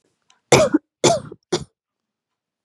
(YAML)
three_cough_length: 2.6 s
three_cough_amplitude: 32767
three_cough_signal_mean_std_ratio: 0.32
survey_phase: beta (2021-08-13 to 2022-03-07)
age: 18-44
gender: Female
wearing_mask: 'No'
symptom_none: true
smoker_status: Never smoked
respiratory_condition_asthma: false
respiratory_condition_other: false
recruitment_source: REACT
submission_delay: 3 days
covid_test_result: Negative
covid_test_method: RT-qPCR